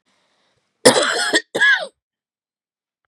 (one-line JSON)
{"cough_length": "3.1 s", "cough_amplitude": 32768, "cough_signal_mean_std_ratio": 0.39, "survey_phase": "beta (2021-08-13 to 2022-03-07)", "age": "45-64", "gender": "Female", "wearing_mask": "No", "symptom_none": true, "symptom_onset": "8 days", "smoker_status": "Never smoked", "respiratory_condition_asthma": false, "respiratory_condition_other": false, "recruitment_source": "REACT", "submission_delay": "1 day", "covid_test_result": "Negative", "covid_test_method": "RT-qPCR"}